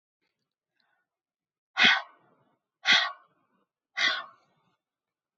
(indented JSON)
{
  "exhalation_length": "5.4 s",
  "exhalation_amplitude": 14368,
  "exhalation_signal_mean_std_ratio": 0.27,
  "survey_phase": "beta (2021-08-13 to 2022-03-07)",
  "age": "65+",
  "gender": "Female",
  "wearing_mask": "No",
  "symptom_none": true,
  "smoker_status": "Ex-smoker",
  "respiratory_condition_asthma": false,
  "respiratory_condition_other": false,
  "recruitment_source": "REACT",
  "submission_delay": "1 day",
  "covid_test_result": "Negative",
  "covid_test_method": "RT-qPCR",
  "influenza_a_test_result": "Negative",
  "influenza_b_test_result": "Negative"
}